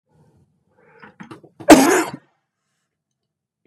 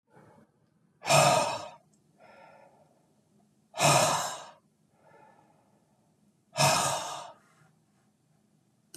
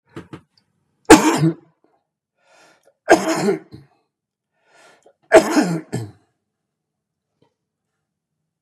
{"cough_length": "3.7 s", "cough_amplitude": 32768, "cough_signal_mean_std_ratio": 0.24, "exhalation_length": "9.0 s", "exhalation_amplitude": 12335, "exhalation_signal_mean_std_ratio": 0.35, "three_cough_length": "8.6 s", "three_cough_amplitude": 32768, "three_cough_signal_mean_std_ratio": 0.27, "survey_phase": "beta (2021-08-13 to 2022-03-07)", "age": "65+", "gender": "Male", "wearing_mask": "No", "symptom_cough_any": true, "symptom_change_to_sense_of_smell_or_taste": true, "symptom_loss_of_taste": true, "symptom_onset": "6 days", "smoker_status": "Ex-smoker", "respiratory_condition_asthma": false, "respiratory_condition_other": false, "recruitment_source": "Test and Trace", "submission_delay": "2 days", "covid_test_result": "Positive", "covid_test_method": "RT-qPCR", "covid_ct_value": 16.4, "covid_ct_gene": "ORF1ab gene", "covid_ct_mean": 17.0, "covid_viral_load": "2700000 copies/ml", "covid_viral_load_category": "High viral load (>1M copies/ml)"}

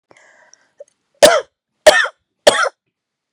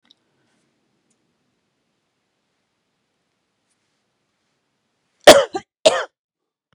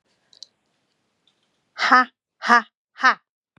{"three_cough_length": "3.3 s", "three_cough_amplitude": 32768, "three_cough_signal_mean_std_ratio": 0.31, "cough_length": "6.7 s", "cough_amplitude": 32768, "cough_signal_mean_std_ratio": 0.15, "exhalation_length": "3.6 s", "exhalation_amplitude": 32574, "exhalation_signal_mean_std_ratio": 0.27, "survey_phase": "beta (2021-08-13 to 2022-03-07)", "age": "45-64", "gender": "Female", "wearing_mask": "No", "symptom_cough_any": true, "symptom_shortness_of_breath": true, "symptom_onset": "12 days", "smoker_status": "Never smoked", "respiratory_condition_asthma": true, "respiratory_condition_other": false, "recruitment_source": "REACT", "submission_delay": "1 day", "covid_test_result": "Negative", "covid_test_method": "RT-qPCR", "influenza_a_test_result": "Negative", "influenza_b_test_result": "Negative"}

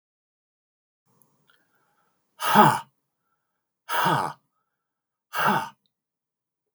{"exhalation_length": "6.7 s", "exhalation_amplitude": 22351, "exhalation_signal_mean_std_ratio": 0.29, "survey_phase": "beta (2021-08-13 to 2022-03-07)", "age": "65+", "gender": "Male", "wearing_mask": "No", "symptom_none": true, "smoker_status": "Never smoked", "respiratory_condition_asthma": false, "respiratory_condition_other": false, "recruitment_source": "REACT", "submission_delay": "3 days", "covid_test_result": "Negative", "covid_test_method": "RT-qPCR", "influenza_a_test_result": "Negative", "influenza_b_test_result": "Negative"}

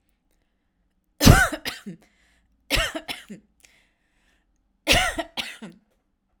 {"three_cough_length": "6.4 s", "three_cough_amplitude": 32768, "three_cough_signal_mean_std_ratio": 0.28, "survey_phase": "alpha (2021-03-01 to 2021-08-12)", "age": "18-44", "gender": "Female", "wearing_mask": "No", "symptom_none": true, "smoker_status": "Never smoked", "respiratory_condition_asthma": false, "respiratory_condition_other": false, "recruitment_source": "REACT", "submission_delay": "2 days", "covid_test_result": "Negative", "covid_test_method": "RT-qPCR"}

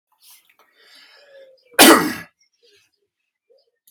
{"cough_length": "3.9 s", "cough_amplitude": 32768, "cough_signal_mean_std_ratio": 0.23, "survey_phase": "alpha (2021-03-01 to 2021-08-12)", "age": "45-64", "gender": "Male", "wearing_mask": "No", "symptom_none": true, "smoker_status": "Never smoked", "respiratory_condition_asthma": false, "respiratory_condition_other": false, "recruitment_source": "REACT", "submission_delay": "3 days", "covid_test_result": "Negative", "covid_test_method": "RT-qPCR"}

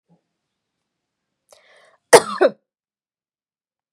{"cough_length": "3.9 s", "cough_amplitude": 32768, "cough_signal_mean_std_ratio": 0.17, "survey_phase": "beta (2021-08-13 to 2022-03-07)", "age": "18-44", "gender": "Female", "wearing_mask": "No", "symptom_none": true, "smoker_status": "Never smoked", "respiratory_condition_asthma": false, "respiratory_condition_other": false, "recruitment_source": "REACT", "submission_delay": "0 days", "covid_test_result": "Negative", "covid_test_method": "RT-qPCR", "influenza_a_test_result": "Negative", "influenza_b_test_result": "Negative"}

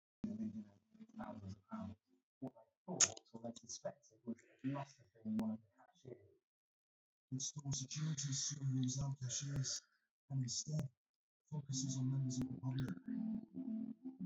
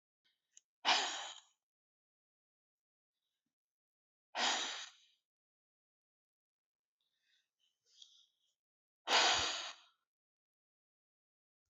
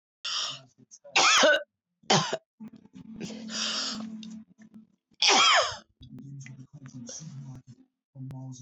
{"three_cough_length": "14.3 s", "three_cough_amplitude": 5128, "three_cough_signal_mean_std_ratio": 0.64, "exhalation_length": "11.7 s", "exhalation_amplitude": 4131, "exhalation_signal_mean_std_ratio": 0.26, "cough_length": "8.6 s", "cough_amplitude": 14461, "cough_signal_mean_std_ratio": 0.44, "survey_phase": "beta (2021-08-13 to 2022-03-07)", "age": "45-64", "gender": "Female", "wearing_mask": "No", "symptom_none": true, "smoker_status": "Current smoker (1 to 10 cigarettes per day)", "respiratory_condition_asthma": true, "respiratory_condition_other": false, "recruitment_source": "REACT", "submission_delay": "4 days", "covid_test_result": "Negative", "covid_test_method": "RT-qPCR", "influenza_a_test_result": "Negative", "influenza_b_test_result": "Negative"}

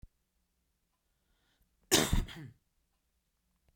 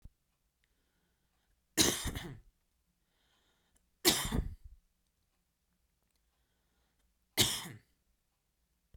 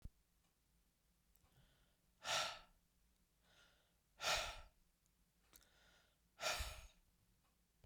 {"cough_length": "3.8 s", "cough_amplitude": 7819, "cough_signal_mean_std_ratio": 0.24, "three_cough_length": "9.0 s", "three_cough_amplitude": 10052, "three_cough_signal_mean_std_ratio": 0.26, "exhalation_length": "7.9 s", "exhalation_amplitude": 1610, "exhalation_signal_mean_std_ratio": 0.32, "survey_phase": "beta (2021-08-13 to 2022-03-07)", "age": "18-44", "gender": "Male", "wearing_mask": "No", "symptom_none": true, "smoker_status": "Never smoked", "respiratory_condition_asthma": false, "respiratory_condition_other": false, "recruitment_source": "REACT", "submission_delay": "3 days", "covid_test_result": "Negative", "covid_test_method": "RT-qPCR", "influenza_a_test_result": "Negative", "influenza_b_test_result": "Negative"}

